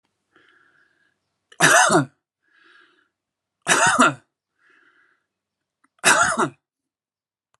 {"three_cough_length": "7.6 s", "three_cough_amplitude": 29212, "three_cough_signal_mean_std_ratio": 0.33, "survey_phase": "alpha (2021-03-01 to 2021-08-12)", "age": "45-64", "gender": "Male", "wearing_mask": "No", "symptom_none": true, "smoker_status": "Never smoked", "respiratory_condition_asthma": true, "respiratory_condition_other": false, "recruitment_source": "REACT", "submission_delay": "3 days", "covid_test_result": "Negative", "covid_test_method": "RT-qPCR"}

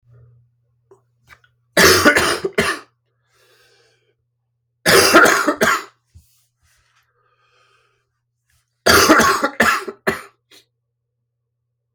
{"three_cough_length": "11.9 s", "three_cough_amplitude": 32767, "three_cough_signal_mean_std_ratio": 0.37, "survey_phase": "beta (2021-08-13 to 2022-03-07)", "age": "45-64", "gender": "Male", "wearing_mask": "No", "symptom_cough_any": true, "symptom_new_continuous_cough": true, "symptom_runny_or_blocked_nose": true, "symptom_sore_throat": true, "symptom_fatigue": true, "symptom_onset": "8 days", "smoker_status": "Never smoked", "respiratory_condition_asthma": false, "respiratory_condition_other": false, "recruitment_source": "Test and Trace", "submission_delay": "2 days", "covid_test_result": "Positive", "covid_test_method": "RT-qPCR", "covid_ct_value": 33.6, "covid_ct_gene": "N gene"}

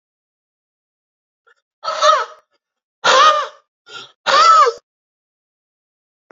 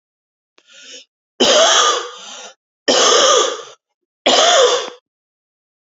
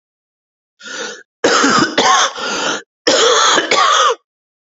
{"exhalation_length": "6.3 s", "exhalation_amplitude": 29296, "exhalation_signal_mean_std_ratio": 0.37, "three_cough_length": "5.9 s", "three_cough_amplitude": 32767, "three_cough_signal_mean_std_ratio": 0.51, "cough_length": "4.8 s", "cough_amplitude": 32767, "cough_signal_mean_std_ratio": 0.64, "survey_phase": "beta (2021-08-13 to 2022-03-07)", "age": "45-64", "gender": "Male", "wearing_mask": "No", "symptom_cough_any": true, "symptom_runny_or_blocked_nose": true, "symptom_shortness_of_breath": true, "symptom_abdominal_pain": true, "symptom_fatigue": true, "symptom_headache": true, "smoker_status": "Never smoked", "respiratory_condition_asthma": true, "respiratory_condition_other": false, "recruitment_source": "Test and Trace", "submission_delay": "2 days", "covid_test_result": "Positive", "covid_test_method": "LFT"}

